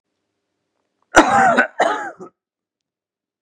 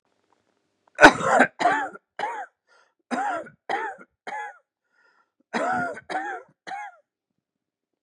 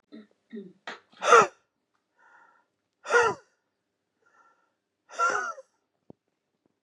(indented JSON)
{
  "cough_length": "3.4 s",
  "cough_amplitude": 32768,
  "cough_signal_mean_std_ratio": 0.36,
  "three_cough_length": "8.0 s",
  "three_cough_amplitude": 32768,
  "three_cough_signal_mean_std_ratio": 0.33,
  "exhalation_length": "6.8 s",
  "exhalation_amplitude": 22028,
  "exhalation_signal_mean_std_ratio": 0.26,
  "survey_phase": "beta (2021-08-13 to 2022-03-07)",
  "age": "45-64",
  "gender": "Male",
  "wearing_mask": "No",
  "symptom_cough_any": true,
  "symptom_runny_or_blocked_nose": true,
  "symptom_sore_throat": true,
  "symptom_onset": "2 days",
  "smoker_status": "Ex-smoker",
  "respiratory_condition_asthma": true,
  "respiratory_condition_other": false,
  "recruitment_source": "Test and Trace",
  "submission_delay": "2 days",
  "covid_test_result": "Positive",
  "covid_test_method": "RT-qPCR",
  "covid_ct_value": 16.9,
  "covid_ct_gene": "ORF1ab gene",
  "covid_ct_mean": 17.3,
  "covid_viral_load": "2100000 copies/ml",
  "covid_viral_load_category": "High viral load (>1M copies/ml)"
}